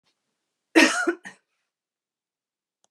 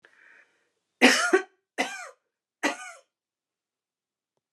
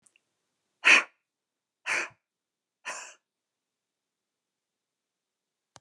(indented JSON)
{
  "cough_length": "2.9 s",
  "cough_amplitude": 26460,
  "cough_signal_mean_std_ratio": 0.25,
  "three_cough_length": "4.5 s",
  "three_cough_amplitude": 24165,
  "three_cough_signal_mean_std_ratio": 0.27,
  "exhalation_length": "5.8 s",
  "exhalation_amplitude": 16557,
  "exhalation_signal_mean_std_ratio": 0.18,
  "survey_phase": "beta (2021-08-13 to 2022-03-07)",
  "age": "65+",
  "gender": "Female",
  "wearing_mask": "No",
  "symptom_none": true,
  "symptom_onset": "9 days",
  "smoker_status": "Never smoked",
  "respiratory_condition_asthma": false,
  "respiratory_condition_other": false,
  "recruitment_source": "Test and Trace",
  "submission_delay": "7 days",
  "covid_test_result": "Negative",
  "covid_test_method": "RT-qPCR"
}